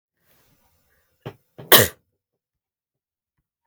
{"cough_length": "3.7 s", "cough_amplitude": 32768, "cough_signal_mean_std_ratio": 0.16, "survey_phase": "beta (2021-08-13 to 2022-03-07)", "age": "18-44", "gender": "Female", "wearing_mask": "No", "symptom_none": true, "smoker_status": "Never smoked", "respiratory_condition_asthma": false, "respiratory_condition_other": false, "recruitment_source": "REACT", "submission_delay": "2 days", "covid_test_result": "Negative", "covid_test_method": "RT-qPCR"}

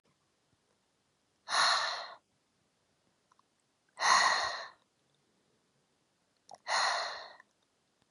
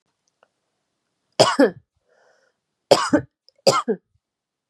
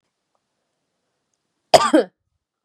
{"exhalation_length": "8.1 s", "exhalation_amplitude": 7376, "exhalation_signal_mean_std_ratio": 0.35, "three_cough_length": "4.7 s", "three_cough_amplitude": 32728, "three_cough_signal_mean_std_ratio": 0.29, "cough_length": "2.6 s", "cough_amplitude": 32768, "cough_signal_mean_std_ratio": 0.22, "survey_phase": "beta (2021-08-13 to 2022-03-07)", "age": "18-44", "gender": "Female", "wearing_mask": "No", "symptom_none": true, "smoker_status": "Never smoked", "respiratory_condition_asthma": false, "respiratory_condition_other": false, "recruitment_source": "REACT", "submission_delay": "1 day", "covid_test_result": "Negative", "covid_test_method": "RT-qPCR", "influenza_a_test_result": "Negative", "influenza_b_test_result": "Negative"}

